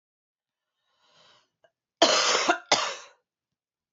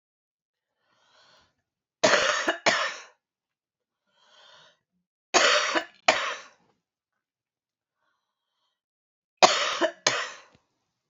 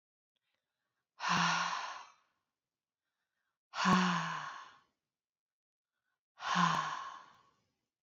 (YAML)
cough_length: 3.9 s
cough_amplitude: 18788
cough_signal_mean_std_ratio: 0.33
three_cough_length: 11.1 s
three_cough_amplitude: 27547
three_cough_signal_mean_std_ratio: 0.32
exhalation_length: 8.0 s
exhalation_amplitude: 5085
exhalation_signal_mean_std_ratio: 0.4
survey_phase: beta (2021-08-13 to 2022-03-07)
age: 18-44
gender: Female
wearing_mask: 'No'
symptom_runny_or_blocked_nose: true
symptom_sore_throat: true
symptom_fatigue: true
symptom_headache: true
symptom_change_to_sense_of_smell_or_taste: true
symptom_loss_of_taste: true
smoker_status: Never smoked
respiratory_condition_asthma: true
respiratory_condition_other: false
recruitment_source: Test and Trace
submission_delay: 3 days
covid_test_result: Positive
covid_test_method: ePCR